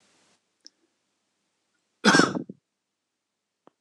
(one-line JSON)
{"cough_length": "3.8 s", "cough_amplitude": 23921, "cough_signal_mean_std_ratio": 0.21, "survey_phase": "beta (2021-08-13 to 2022-03-07)", "age": "45-64", "gender": "Male", "wearing_mask": "No", "symptom_none": true, "smoker_status": "Never smoked", "respiratory_condition_asthma": true, "respiratory_condition_other": false, "recruitment_source": "REACT", "submission_delay": "1 day", "covid_test_result": "Negative", "covid_test_method": "RT-qPCR", "influenza_a_test_result": "Negative", "influenza_b_test_result": "Negative"}